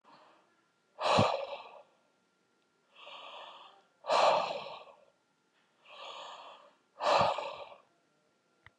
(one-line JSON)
{"exhalation_length": "8.8 s", "exhalation_amplitude": 7400, "exhalation_signal_mean_std_ratio": 0.37, "survey_phase": "beta (2021-08-13 to 2022-03-07)", "age": "45-64", "gender": "Male", "wearing_mask": "No", "symptom_none": true, "smoker_status": "Ex-smoker", "respiratory_condition_asthma": false, "respiratory_condition_other": false, "recruitment_source": "REACT", "submission_delay": "1 day", "covid_test_result": "Negative", "covid_test_method": "RT-qPCR"}